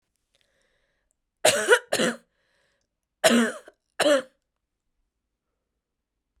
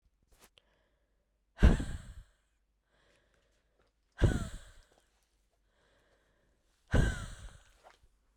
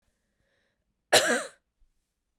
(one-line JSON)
{"three_cough_length": "6.4 s", "three_cough_amplitude": 24436, "three_cough_signal_mean_std_ratio": 0.31, "exhalation_length": "8.4 s", "exhalation_amplitude": 11767, "exhalation_signal_mean_std_ratio": 0.24, "cough_length": "2.4 s", "cough_amplitude": 18750, "cough_signal_mean_std_ratio": 0.26, "survey_phase": "beta (2021-08-13 to 2022-03-07)", "age": "18-44", "gender": "Female", "wearing_mask": "No", "symptom_runny_or_blocked_nose": true, "symptom_loss_of_taste": true, "smoker_status": "Never smoked", "respiratory_condition_asthma": false, "respiratory_condition_other": false, "recruitment_source": "Test and Trace", "submission_delay": "2 days", "covid_test_result": "Positive", "covid_test_method": "RT-qPCR", "covid_ct_value": 20.5, "covid_ct_gene": "ORF1ab gene", "covid_ct_mean": 21.7, "covid_viral_load": "78000 copies/ml", "covid_viral_load_category": "Low viral load (10K-1M copies/ml)"}